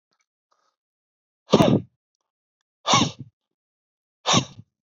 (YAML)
exhalation_length: 4.9 s
exhalation_amplitude: 27048
exhalation_signal_mean_std_ratio: 0.28
survey_phase: beta (2021-08-13 to 2022-03-07)
age: 45-64
gender: Male
wearing_mask: 'No'
symptom_sore_throat: true
smoker_status: Never smoked
respiratory_condition_asthma: false
respiratory_condition_other: false
recruitment_source: Test and Trace
submission_delay: 1 day
covid_test_result: Positive
covid_test_method: ePCR